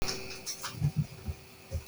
{
  "exhalation_length": "1.9 s",
  "exhalation_amplitude": 5279,
  "exhalation_signal_mean_std_ratio": 0.66,
  "survey_phase": "beta (2021-08-13 to 2022-03-07)",
  "age": "45-64",
  "gender": "Male",
  "wearing_mask": "No",
  "symptom_none": true,
  "smoker_status": "Never smoked",
  "respiratory_condition_asthma": false,
  "respiratory_condition_other": false,
  "recruitment_source": "REACT",
  "submission_delay": "3 days",
  "covid_test_result": "Negative",
  "covid_test_method": "RT-qPCR"
}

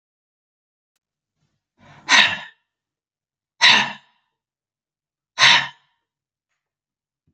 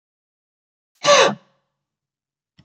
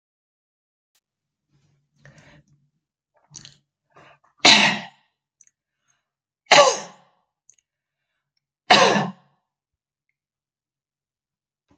{
  "exhalation_length": "7.3 s",
  "exhalation_amplitude": 32035,
  "exhalation_signal_mean_std_ratio": 0.25,
  "cough_length": "2.6 s",
  "cough_amplitude": 27542,
  "cough_signal_mean_std_ratio": 0.26,
  "three_cough_length": "11.8 s",
  "three_cough_amplitude": 32202,
  "three_cough_signal_mean_std_ratio": 0.22,
  "survey_phase": "beta (2021-08-13 to 2022-03-07)",
  "age": "65+",
  "gender": "Female",
  "wearing_mask": "No",
  "symptom_none": true,
  "smoker_status": "Ex-smoker",
  "respiratory_condition_asthma": false,
  "respiratory_condition_other": false,
  "recruitment_source": "REACT",
  "submission_delay": "1 day",
  "covid_test_result": "Negative",
  "covid_test_method": "RT-qPCR",
  "influenza_a_test_result": "Negative",
  "influenza_b_test_result": "Negative"
}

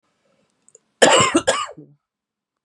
{
  "cough_length": "2.6 s",
  "cough_amplitude": 32768,
  "cough_signal_mean_std_ratio": 0.35,
  "survey_phase": "beta (2021-08-13 to 2022-03-07)",
  "age": "18-44",
  "gender": "Female",
  "wearing_mask": "No",
  "symptom_cough_any": true,
  "symptom_onset": "9 days",
  "smoker_status": "Ex-smoker",
  "respiratory_condition_asthma": false,
  "respiratory_condition_other": false,
  "recruitment_source": "REACT",
  "submission_delay": "3 days",
  "covid_test_result": "Negative",
  "covid_test_method": "RT-qPCR",
  "influenza_a_test_result": "Unknown/Void",
  "influenza_b_test_result": "Unknown/Void"
}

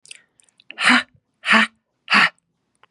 {
  "exhalation_length": "2.9 s",
  "exhalation_amplitude": 28615,
  "exhalation_signal_mean_std_ratio": 0.37,
  "survey_phase": "beta (2021-08-13 to 2022-03-07)",
  "age": "45-64",
  "gender": "Female",
  "wearing_mask": "No",
  "symptom_none": true,
  "smoker_status": "Ex-smoker",
  "respiratory_condition_asthma": false,
  "respiratory_condition_other": false,
  "recruitment_source": "REACT",
  "submission_delay": "1 day",
  "covid_test_result": "Negative",
  "covid_test_method": "RT-qPCR",
  "influenza_a_test_result": "Negative",
  "influenza_b_test_result": "Negative"
}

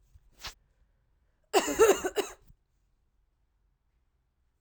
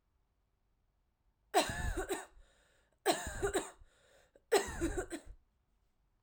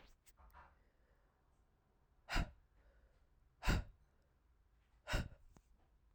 {
  "cough_length": "4.6 s",
  "cough_amplitude": 12245,
  "cough_signal_mean_std_ratio": 0.26,
  "three_cough_length": "6.2 s",
  "three_cough_amplitude": 7291,
  "three_cough_signal_mean_std_ratio": 0.4,
  "exhalation_length": "6.1 s",
  "exhalation_amplitude": 2366,
  "exhalation_signal_mean_std_ratio": 0.27,
  "survey_phase": "alpha (2021-03-01 to 2021-08-12)",
  "age": "18-44",
  "gender": "Female",
  "wearing_mask": "No",
  "symptom_cough_any": true,
  "symptom_shortness_of_breath": true,
  "symptom_fatigue": true,
  "smoker_status": "Never smoked",
  "respiratory_condition_asthma": false,
  "respiratory_condition_other": false,
  "recruitment_source": "Test and Trace",
  "submission_delay": "1 day",
  "covid_test_result": "Positive",
  "covid_test_method": "LFT"
}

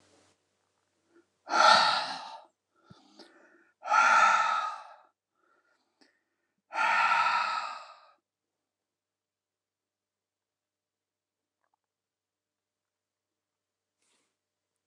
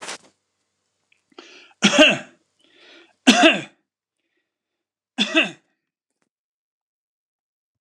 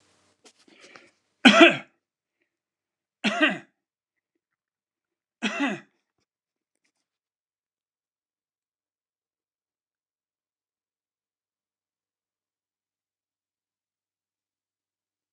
{
  "exhalation_length": "14.9 s",
  "exhalation_amplitude": 14415,
  "exhalation_signal_mean_std_ratio": 0.32,
  "three_cough_length": "7.8 s",
  "three_cough_amplitude": 29204,
  "three_cough_signal_mean_std_ratio": 0.26,
  "cough_length": "15.3 s",
  "cough_amplitude": 29174,
  "cough_signal_mean_std_ratio": 0.15,
  "survey_phase": "alpha (2021-03-01 to 2021-08-12)",
  "age": "65+",
  "gender": "Male",
  "wearing_mask": "No",
  "symptom_none": true,
  "smoker_status": "Never smoked",
  "respiratory_condition_asthma": false,
  "respiratory_condition_other": false,
  "recruitment_source": "REACT",
  "submission_delay": "2 days",
  "covid_test_result": "Negative",
  "covid_test_method": "RT-qPCR"
}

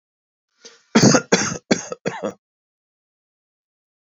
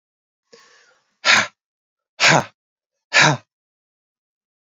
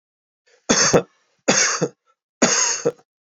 {
  "cough_length": "4.1 s",
  "cough_amplitude": 31968,
  "cough_signal_mean_std_ratio": 0.3,
  "exhalation_length": "4.7 s",
  "exhalation_amplitude": 30329,
  "exhalation_signal_mean_std_ratio": 0.29,
  "three_cough_length": "3.2 s",
  "three_cough_amplitude": 31321,
  "three_cough_signal_mean_std_ratio": 0.48,
  "survey_phase": "alpha (2021-03-01 to 2021-08-12)",
  "age": "45-64",
  "gender": "Male",
  "wearing_mask": "No",
  "symptom_none": true,
  "smoker_status": "Never smoked",
  "respiratory_condition_asthma": false,
  "respiratory_condition_other": false,
  "recruitment_source": "REACT",
  "submission_delay": "2 days",
  "covid_test_result": "Negative",
  "covid_test_method": "RT-qPCR"
}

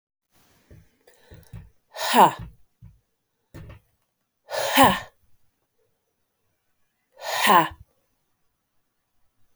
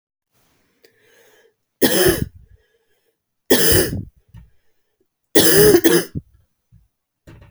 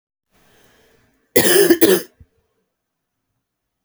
{
  "exhalation_length": "9.6 s",
  "exhalation_amplitude": 31804,
  "exhalation_signal_mean_std_ratio": 0.26,
  "three_cough_length": "7.5 s",
  "three_cough_amplitude": 32768,
  "three_cough_signal_mean_std_ratio": 0.37,
  "cough_length": "3.8 s",
  "cough_amplitude": 32768,
  "cough_signal_mean_std_ratio": 0.32,
  "survey_phase": "beta (2021-08-13 to 2022-03-07)",
  "age": "18-44",
  "gender": "Female",
  "wearing_mask": "No",
  "symptom_cough_any": true,
  "symptom_runny_or_blocked_nose": true,
  "symptom_fatigue": true,
  "symptom_change_to_sense_of_smell_or_taste": true,
  "symptom_loss_of_taste": true,
  "symptom_onset": "6 days",
  "smoker_status": "Never smoked",
  "respiratory_condition_asthma": false,
  "respiratory_condition_other": false,
  "recruitment_source": "Test and Trace",
  "submission_delay": "2 days",
  "covid_test_result": "Positive",
  "covid_test_method": "RT-qPCR",
  "covid_ct_value": 21.2,
  "covid_ct_gene": "ORF1ab gene",
  "covid_ct_mean": 21.9,
  "covid_viral_load": "67000 copies/ml",
  "covid_viral_load_category": "Low viral load (10K-1M copies/ml)"
}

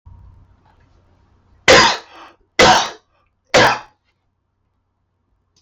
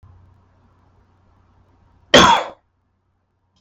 {
  "three_cough_length": "5.6 s",
  "three_cough_amplitude": 32768,
  "three_cough_signal_mean_std_ratio": 0.32,
  "cough_length": "3.6 s",
  "cough_amplitude": 32768,
  "cough_signal_mean_std_ratio": 0.24,
  "survey_phase": "beta (2021-08-13 to 2022-03-07)",
  "age": "18-44",
  "gender": "Male",
  "wearing_mask": "No",
  "symptom_none": true,
  "smoker_status": "Never smoked",
  "respiratory_condition_asthma": false,
  "respiratory_condition_other": false,
  "recruitment_source": "REACT",
  "submission_delay": "0 days",
  "covid_test_result": "Negative",
  "covid_test_method": "RT-qPCR"
}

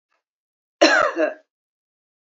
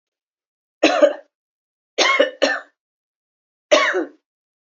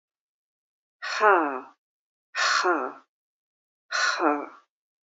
{
  "cough_length": "2.4 s",
  "cough_amplitude": 32767,
  "cough_signal_mean_std_ratio": 0.33,
  "three_cough_length": "4.8 s",
  "three_cough_amplitude": 28555,
  "three_cough_signal_mean_std_ratio": 0.37,
  "exhalation_length": "5.0 s",
  "exhalation_amplitude": 17993,
  "exhalation_signal_mean_std_ratio": 0.42,
  "survey_phase": "beta (2021-08-13 to 2022-03-07)",
  "age": "45-64",
  "gender": "Female",
  "wearing_mask": "No",
  "symptom_none": true,
  "symptom_onset": "6 days",
  "smoker_status": "Never smoked",
  "respiratory_condition_asthma": false,
  "respiratory_condition_other": false,
  "recruitment_source": "REACT",
  "submission_delay": "1 day",
  "covid_test_result": "Negative",
  "covid_test_method": "RT-qPCR",
  "influenza_a_test_result": "Unknown/Void",
  "influenza_b_test_result": "Unknown/Void"
}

